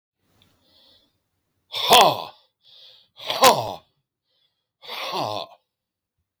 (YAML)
exhalation_length: 6.4 s
exhalation_amplitude: 32768
exhalation_signal_mean_std_ratio: 0.29
survey_phase: beta (2021-08-13 to 2022-03-07)
age: 65+
gender: Male
wearing_mask: 'No'
symptom_cough_any: true
symptom_new_continuous_cough: true
symptom_sore_throat: true
symptom_abdominal_pain: true
symptom_fatigue: true
symptom_fever_high_temperature: true
symptom_headache: true
symptom_other: true
symptom_onset: 3 days
smoker_status: Ex-smoker
respiratory_condition_asthma: false
respiratory_condition_other: false
recruitment_source: Test and Trace
submission_delay: 3 days
covid_test_result: Positive
covid_test_method: RT-qPCR
covid_ct_value: 11.7
covid_ct_gene: ORF1ab gene
covid_ct_mean: 12.1
covid_viral_load: 110000000 copies/ml
covid_viral_load_category: High viral load (>1M copies/ml)